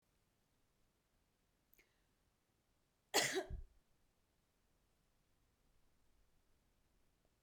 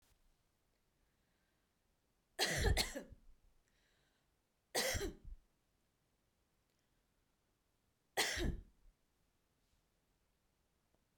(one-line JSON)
{"cough_length": "7.4 s", "cough_amplitude": 2616, "cough_signal_mean_std_ratio": 0.2, "three_cough_length": "11.2 s", "three_cough_amplitude": 2437, "three_cough_signal_mean_std_ratio": 0.29, "survey_phase": "beta (2021-08-13 to 2022-03-07)", "age": "45-64", "gender": "Female", "wearing_mask": "No", "symptom_none": true, "smoker_status": "Never smoked", "respiratory_condition_asthma": false, "respiratory_condition_other": false, "recruitment_source": "REACT", "submission_delay": "1 day", "covid_test_result": "Negative", "covid_test_method": "RT-qPCR"}